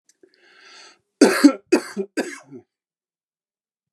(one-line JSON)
{"cough_length": "3.9 s", "cough_amplitude": 31433, "cough_signal_mean_std_ratio": 0.27, "survey_phase": "beta (2021-08-13 to 2022-03-07)", "age": "45-64", "gender": "Male", "wearing_mask": "No", "symptom_sore_throat": true, "symptom_onset": "8 days", "smoker_status": "Never smoked", "respiratory_condition_asthma": true, "respiratory_condition_other": false, "recruitment_source": "REACT", "submission_delay": "1 day", "covid_test_result": "Negative", "covid_test_method": "RT-qPCR"}